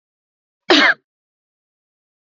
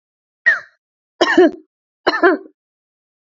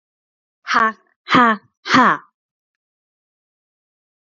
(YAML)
cough_length: 2.4 s
cough_amplitude: 32767
cough_signal_mean_std_ratio: 0.26
three_cough_length: 3.3 s
three_cough_amplitude: 30542
three_cough_signal_mean_std_ratio: 0.36
exhalation_length: 4.3 s
exhalation_amplitude: 28500
exhalation_signal_mean_std_ratio: 0.32
survey_phase: beta (2021-08-13 to 2022-03-07)
age: 18-44
gender: Female
wearing_mask: 'No'
symptom_fatigue: true
smoker_status: Never smoked
respiratory_condition_asthma: false
respiratory_condition_other: false
recruitment_source: REACT
submission_delay: 2 days
covid_test_result: Negative
covid_test_method: RT-qPCR
covid_ct_value: 37.2
covid_ct_gene: N gene
influenza_a_test_result: Negative
influenza_b_test_result: Negative